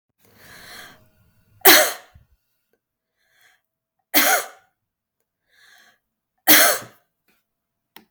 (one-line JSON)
{"three_cough_length": "8.1 s", "three_cough_amplitude": 32768, "three_cough_signal_mean_std_ratio": 0.26, "survey_phase": "beta (2021-08-13 to 2022-03-07)", "age": "45-64", "gender": "Female", "wearing_mask": "No", "symptom_none": true, "smoker_status": "Never smoked", "respiratory_condition_asthma": false, "respiratory_condition_other": false, "recruitment_source": "REACT", "submission_delay": "2 days", "covid_test_result": "Negative", "covid_test_method": "RT-qPCR", "influenza_a_test_result": "Negative", "influenza_b_test_result": "Negative"}